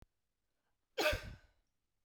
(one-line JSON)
{"cough_length": "2.0 s", "cough_amplitude": 3128, "cough_signal_mean_std_ratio": 0.29, "survey_phase": "beta (2021-08-13 to 2022-03-07)", "age": "45-64", "gender": "Female", "wearing_mask": "No", "symptom_none": true, "smoker_status": "Ex-smoker", "respiratory_condition_asthma": false, "respiratory_condition_other": false, "recruitment_source": "REACT", "submission_delay": "5 days", "covid_test_result": "Negative", "covid_test_method": "RT-qPCR"}